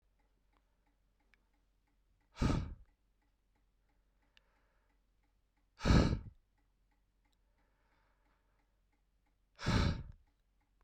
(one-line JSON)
{"exhalation_length": "10.8 s", "exhalation_amplitude": 5634, "exhalation_signal_mean_std_ratio": 0.24, "survey_phase": "beta (2021-08-13 to 2022-03-07)", "age": "18-44", "gender": "Male", "wearing_mask": "No", "symptom_cough_any": true, "symptom_loss_of_taste": true, "symptom_onset": "10 days", "smoker_status": "Never smoked", "respiratory_condition_asthma": false, "respiratory_condition_other": false, "recruitment_source": "Test and Trace", "submission_delay": "2 days", "covid_test_result": "Positive", "covid_test_method": "ePCR"}